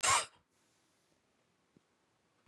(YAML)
cough_length: 2.5 s
cough_amplitude: 5275
cough_signal_mean_std_ratio: 0.24
survey_phase: beta (2021-08-13 to 2022-03-07)
age: 45-64
gender: Female
wearing_mask: 'No'
symptom_none: true
smoker_status: Never smoked
respiratory_condition_asthma: false
respiratory_condition_other: false
recruitment_source: REACT
submission_delay: 12 days
covid_test_result: Negative
covid_test_method: RT-qPCR
influenza_a_test_result: Negative
influenza_b_test_result: Negative